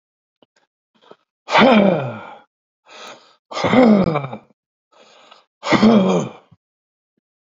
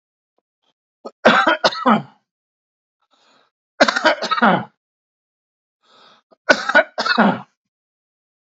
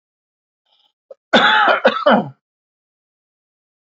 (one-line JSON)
{"exhalation_length": "7.4 s", "exhalation_amplitude": 32768, "exhalation_signal_mean_std_ratio": 0.41, "three_cough_length": "8.4 s", "three_cough_amplitude": 32767, "three_cough_signal_mean_std_ratio": 0.35, "cough_length": "3.8 s", "cough_amplitude": 30305, "cough_signal_mean_std_ratio": 0.37, "survey_phase": "beta (2021-08-13 to 2022-03-07)", "age": "65+", "gender": "Male", "wearing_mask": "No", "symptom_cough_any": true, "smoker_status": "Ex-smoker", "respiratory_condition_asthma": false, "respiratory_condition_other": false, "recruitment_source": "REACT", "submission_delay": "3 days", "covid_test_result": "Negative", "covid_test_method": "RT-qPCR", "influenza_a_test_result": "Negative", "influenza_b_test_result": "Negative"}